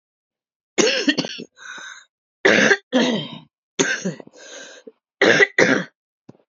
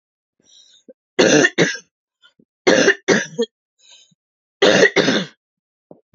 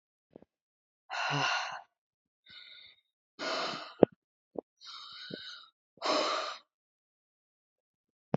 {"cough_length": "6.5 s", "cough_amplitude": 30496, "cough_signal_mean_std_ratio": 0.44, "three_cough_length": "6.1 s", "three_cough_amplitude": 31436, "three_cough_signal_mean_std_ratio": 0.4, "exhalation_length": "8.4 s", "exhalation_amplitude": 27428, "exhalation_signal_mean_std_ratio": 0.32, "survey_phase": "alpha (2021-03-01 to 2021-08-12)", "age": "18-44", "gender": "Female", "wearing_mask": "No", "symptom_cough_any": true, "symptom_new_continuous_cough": true, "symptom_shortness_of_breath": true, "symptom_abdominal_pain": true, "symptom_diarrhoea": true, "symptom_fatigue": true, "symptom_fever_high_temperature": true, "symptom_headache": true, "symptom_change_to_sense_of_smell_or_taste": true, "smoker_status": "Never smoked", "respiratory_condition_asthma": true, "respiratory_condition_other": false, "recruitment_source": "Test and Trace", "submission_delay": "1 day", "covid_test_result": "Positive", "covid_test_method": "RT-qPCR", "covid_ct_value": 20.5, "covid_ct_gene": "ORF1ab gene", "covid_ct_mean": 20.9, "covid_viral_load": "140000 copies/ml", "covid_viral_load_category": "Low viral load (10K-1M copies/ml)"}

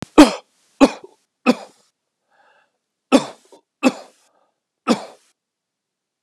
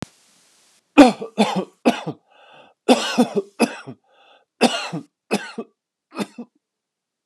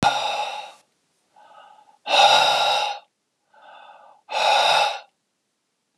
{"three_cough_length": "6.2 s", "three_cough_amplitude": 32768, "three_cough_signal_mean_std_ratio": 0.22, "cough_length": "7.3 s", "cough_amplitude": 32768, "cough_signal_mean_std_ratio": 0.31, "exhalation_length": "6.0 s", "exhalation_amplitude": 22429, "exhalation_signal_mean_std_ratio": 0.49, "survey_phase": "beta (2021-08-13 to 2022-03-07)", "age": "45-64", "gender": "Male", "wearing_mask": "No", "symptom_none": true, "smoker_status": "Never smoked", "respiratory_condition_asthma": false, "respiratory_condition_other": false, "recruitment_source": "REACT", "submission_delay": "1 day", "covid_test_result": "Negative", "covid_test_method": "RT-qPCR", "influenza_a_test_result": "Unknown/Void", "influenza_b_test_result": "Unknown/Void"}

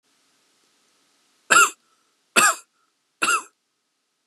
{"three_cough_length": "4.3 s", "three_cough_amplitude": 31376, "three_cough_signal_mean_std_ratio": 0.28, "survey_phase": "beta (2021-08-13 to 2022-03-07)", "age": "18-44", "gender": "Male", "wearing_mask": "No", "symptom_runny_or_blocked_nose": true, "symptom_change_to_sense_of_smell_or_taste": true, "symptom_onset": "11 days", "smoker_status": "Never smoked", "respiratory_condition_asthma": false, "respiratory_condition_other": false, "recruitment_source": "REACT", "submission_delay": "1 day", "covid_test_result": "Negative", "covid_test_method": "RT-qPCR", "influenza_a_test_result": "Negative", "influenza_b_test_result": "Negative"}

